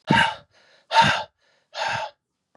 exhalation_length: 2.6 s
exhalation_amplitude: 21270
exhalation_signal_mean_std_ratio: 0.44
survey_phase: beta (2021-08-13 to 2022-03-07)
age: 45-64
gender: Male
wearing_mask: 'No'
symptom_cough_any: true
symptom_sore_throat: true
symptom_headache: true
symptom_loss_of_taste: true
symptom_onset: 6 days
smoker_status: Never smoked
respiratory_condition_asthma: false
respiratory_condition_other: false
recruitment_source: Test and Trace
submission_delay: 3 days
covid_test_result: Positive
covid_test_method: RT-qPCR
covid_ct_value: 25.9
covid_ct_gene: S gene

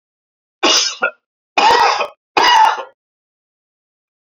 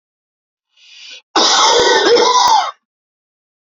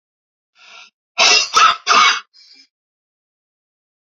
three_cough_length: 4.3 s
three_cough_amplitude: 32768
three_cough_signal_mean_std_ratio: 0.46
cough_length: 3.7 s
cough_amplitude: 32506
cough_signal_mean_std_ratio: 0.56
exhalation_length: 4.0 s
exhalation_amplitude: 32768
exhalation_signal_mean_std_ratio: 0.37
survey_phase: beta (2021-08-13 to 2022-03-07)
age: 45-64
gender: Male
wearing_mask: 'No'
symptom_cough_any: true
symptom_shortness_of_breath: true
symptom_headache: true
symptom_onset: 12 days
smoker_status: Never smoked
respiratory_condition_asthma: true
respiratory_condition_other: false
recruitment_source: REACT
submission_delay: 1 day
covid_test_result: Negative
covid_test_method: RT-qPCR
influenza_a_test_result: Negative
influenza_b_test_result: Negative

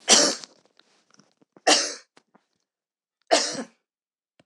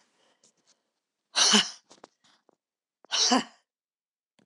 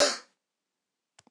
three_cough_length: 4.5 s
three_cough_amplitude: 26028
three_cough_signal_mean_std_ratio: 0.31
exhalation_length: 4.5 s
exhalation_amplitude: 14398
exhalation_signal_mean_std_ratio: 0.3
cough_length: 1.3 s
cough_amplitude: 9593
cough_signal_mean_std_ratio: 0.26
survey_phase: beta (2021-08-13 to 2022-03-07)
age: 65+
gender: Female
wearing_mask: 'No'
symptom_cough_any: true
smoker_status: Never smoked
respiratory_condition_asthma: false
respiratory_condition_other: false
recruitment_source: REACT
submission_delay: 2 days
covid_test_result: Negative
covid_test_method: RT-qPCR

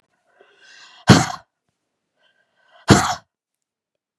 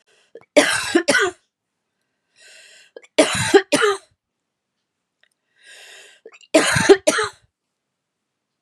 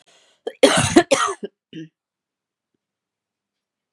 exhalation_length: 4.2 s
exhalation_amplitude: 32768
exhalation_signal_mean_std_ratio: 0.23
three_cough_length: 8.6 s
three_cough_amplitude: 32711
three_cough_signal_mean_std_ratio: 0.34
cough_length: 3.9 s
cough_amplitude: 32767
cough_signal_mean_std_ratio: 0.29
survey_phase: beta (2021-08-13 to 2022-03-07)
age: 45-64
gender: Female
wearing_mask: 'No'
symptom_new_continuous_cough: true
symptom_runny_or_blocked_nose: true
symptom_shortness_of_breath: true
symptom_sore_throat: true
symptom_fatigue: true
symptom_headache: true
smoker_status: Never smoked
respiratory_condition_asthma: true
respiratory_condition_other: false
recruitment_source: Test and Trace
submission_delay: 1 day
covid_test_result: Positive
covid_test_method: LFT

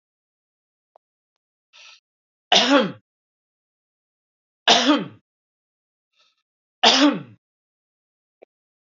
three_cough_length: 8.9 s
three_cough_amplitude: 29468
three_cough_signal_mean_std_ratio: 0.27
survey_phase: beta (2021-08-13 to 2022-03-07)
age: 45-64
gender: Male
wearing_mask: 'No'
symptom_cough_any: true
symptom_onset: 3 days
smoker_status: Ex-smoker
respiratory_condition_asthma: false
respiratory_condition_other: false
recruitment_source: Test and Trace
submission_delay: 2 days
covid_test_result: Negative
covid_test_method: RT-qPCR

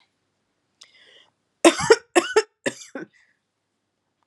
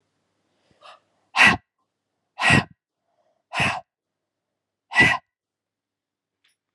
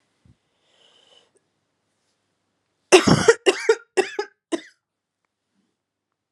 three_cough_length: 4.3 s
three_cough_amplitude: 31943
three_cough_signal_mean_std_ratio: 0.24
exhalation_length: 6.7 s
exhalation_amplitude: 26713
exhalation_signal_mean_std_ratio: 0.27
cough_length: 6.3 s
cough_amplitude: 32763
cough_signal_mean_std_ratio: 0.24
survey_phase: alpha (2021-03-01 to 2021-08-12)
age: 45-64
gender: Female
wearing_mask: 'No'
symptom_cough_any: true
symptom_shortness_of_breath: true
symptom_fatigue: true
symptom_headache: true
symptom_change_to_sense_of_smell_or_taste: true
symptom_loss_of_taste: true
symptom_onset: 7 days
smoker_status: Ex-smoker
respiratory_condition_asthma: false
respiratory_condition_other: false
recruitment_source: Test and Trace
submission_delay: 2 days
covid_test_result: Positive
covid_test_method: RT-qPCR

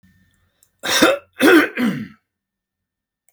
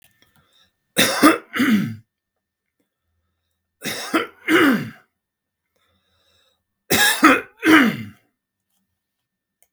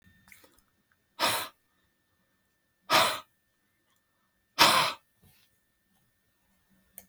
cough_length: 3.3 s
cough_amplitude: 32768
cough_signal_mean_std_ratio: 0.39
three_cough_length: 9.7 s
three_cough_amplitude: 32768
three_cough_signal_mean_std_ratio: 0.37
exhalation_length: 7.1 s
exhalation_amplitude: 17780
exhalation_signal_mean_std_ratio: 0.27
survey_phase: beta (2021-08-13 to 2022-03-07)
age: 65+
gender: Male
wearing_mask: 'No'
symptom_none: true
smoker_status: Ex-smoker
respiratory_condition_asthma: false
respiratory_condition_other: false
recruitment_source: REACT
submission_delay: 3 days
covid_test_result: Negative
covid_test_method: RT-qPCR
influenza_a_test_result: Negative
influenza_b_test_result: Negative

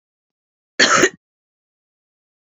cough_length: 2.5 s
cough_amplitude: 30360
cough_signal_mean_std_ratio: 0.27
survey_phase: beta (2021-08-13 to 2022-03-07)
age: 45-64
gender: Female
wearing_mask: 'No'
symptom_cough_any: true
symptom_runny_or_blocked_nose: true
symptom_headache: true
symptom_change_to_sense_of_smell_or_taste: true
symptom_other: true
symptom_onset: 4 days
smoker_status: Current smoker (1 to 10 cigarettes per day)
respiratory_condition_asthma: false
respiratory_condition_other: false
recruitment_source: Test and Trace
submission_delay: 2 days
covid_test_result: Positive
covid_test_method: RT-qPCR
covid_ct_value: 23.9
covid_ct_gene: N gene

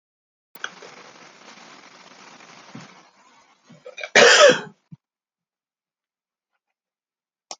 cough_length: 7.6 s
cough_amplitude: 29938
cough_signal_mean_std_ratio: 0.22
survey_phase: alpha (2021-03-01 to 2021-08-12)
age: 65+
gender: Male
wearing_mask: 'No'
symptom_fatigue: true
symptom_headache: true
smoker_status: Never smoked
respiratory_condition_asthma: false
respiratory_condition_other: false
recruitment_source: Test and Trace
submission_delay: 3 days
covid_test_result: Positive
covid_test_method: RT-qPCR
covid_ct_value: 13.8
covid_ct_gene: ORF1ab gene
covid_ct_mean: 14.8
covid_viral_load: 14000000 copies/ml
covid_viral_load_category: High viral load (>1M copies/ml)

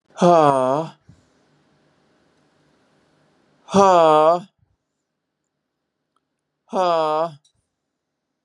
exhalation_length: 8.4 s
exhalation_amplitude: 30445
exhalation_signal_mean_std_ratio: 0.35
survey_phase: beta (2021-08-13 to 2022-03-07)
age: 45-64
gender: Male
wearing_mask: 'No'
symptom_none: true
smoker_status: Never smoked
respiratory_condition_asthma: false
respiratory_condition_other: false
recruitment_source: REACT
submission_delay: 3 days
covid_test_result: Negative
covid_test_method: RT-qPCR
influenza_a_test_result: Negative
influenza_b_test_result: Negative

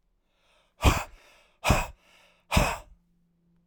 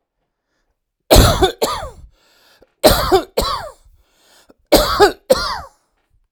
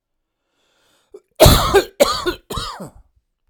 exhalation_length: 3.7 s
exhalation_amplitude: 14402
exhalation_signal_mean_std_ratio: 0.33
three_cough_length: 6.3 s
three_cough_amplitude: 32768
three_cough_signal_mean_std_ratio: 0.4
cough_length: 3.5 s
cough_amplitude: 32768
cough_signal_mean_std_ratio: 0.36
survey_phase: alpha (2021-03-01 to 2021-08-12)
age: 45-64
gender: Male
wearing_mask: 'No'
symptom_none: true
smoker_status: Never smoked
respiratory_condition_asthma: false
respiratory_condition_other: false
recruitment_source: REACT
submission_delay: 1 day
covid_test_result: Negative
covid_test_method: RT-qPCR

